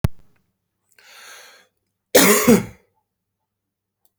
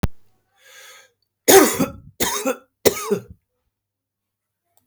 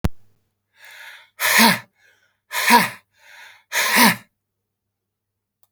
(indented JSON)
{
  "cough_length": "4.2 s",
  "cough_amplitude": 32768,
  "cough_signal_mean_std_ratio": 0.29,
  "three_cough_length": "4.9 s",
  "three_cough_amplitude": 32768,
  "three_cough_signal_mean_std_ratio": 0.32,
  "exhalation_length": "5.7 s",
  "exhalation_amplitude": 32768,
  "exhalation_signal_mean_std_ratio": 0.37,
  "survey_phase": "beta (2021-08-13 to 2022-03-07)",
  "age": "45-64",
  "gender": "Male",
  "wearing_mask": "No",
  "symptom_none": true,
  "smoker_status": "Ex-smoker",
  "respiratory_condition_asthma": false,
  "respiratory_condition_other": false,
  "recruitment_source": "REACT",
  "submission_delay": "2 days",
  "covid_test_result": "Negative",
  "covid_test_method": "RT-qPCR"
}